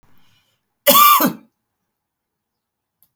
{"cough_length": "3.2 s", "cough_amplitude": 32768, "cough_signal_mean_std_ratio": 0.31, "survey_phase": "alpha (2021-03-01 to 2021-08-12)", "age": "65+", "gender": "Female", "wearing_mask": "No", "symptom_none": true, "smoker_status": "Ex-smoker", "respiratory_condition_asthma": false, "respiratory_condition_other": false, "recruitment_source": "REACT", "submission_delay": "3 days", "covid_test_result": "Negative", "covid_test_method": "RT-qPCR"}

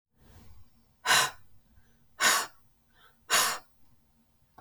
{"exhalation_length": "4.6 s", "exhalation_amplitude": 11414, "exhalation_signal_mean_std_ratio": 0.35, "survey_phase": "beta (2021-08-13 to 2022-03-07)", "age": "45-64", "gender": "Female", "wearing_mask": "No", "symptom_runny_or_blocked_nose": true, "symptom_headache": true, "symptom_onset": "8 days", "smoker_status": "Ex-smoker", "respiratory_condition_asthma": false, "respiratory_condition_other": false, "recruitment_source": "REACT", "submission_delay": "1 day", "covid_test_result": "Negative", "covid_test_method": "RT-qPCR"}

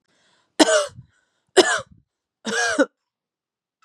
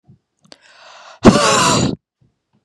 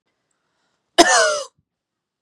{"three_cough_length": "3.8 s", "three_cough_amplitude": 32767, "three_cough_signal_mean_std_ratio": 0.34, "exhalation_length": "2.6 s", "exhalation_amplitude": 32768, "exhalation_signal_mean_std_ratio": 0.41, "cough_length": "2.2 s", "cough_amplitude": 32768, "cough_signal_mean_std_ratio": 0.32, "survey_phase": "beta (2021-08-13 to 2022-03-07)", "age": "18-44", "gender": "Female", "wearing_mask": "No", "symptom_none": true, "smoker_status": "Ex-smoker", "respiratory_condition_asthma": false, "respiratory_condition_other": false, "recruitment_source": "REACT", "submission_delay": "3 days", "covid_test_result": "Negative", "covid_test_method": "RT-qPCR", "influenza_a_test_result": "Negative", "influenza_b_test_result": "Negative"}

